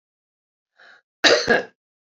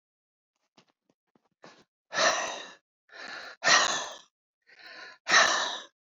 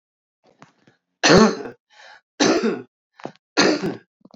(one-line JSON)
{"cough_length": "2.1 s", "cough_amplitude": 31833, "cough_signal_mean_std_ratio": 0.31, "exhalation_length": "6.1 s", "exhalation_amplitude": 14284, "exhalation_signal_mean_std_ratio": 0.37, "three_cough_length": "4.4 s", "three_cough_amplitude": 32767, "three_cough_signal_mean_std_ratio": 0.39, "survey_phase": "alpha (2021-03-01 to 2021-08-12)", "age": "45-64", "gender": "Female", "wearing_mask": "No", "symptom_none": true, "smoker_status": "Ex-smoker", "respiratory_condition_asthma": false, "respiratory_condition_other": true, "recruitment_source": "REACT", "submission_delay": "2 days", "covid_test_result": "Negative", "covid_test_method": "RT-qPCR"}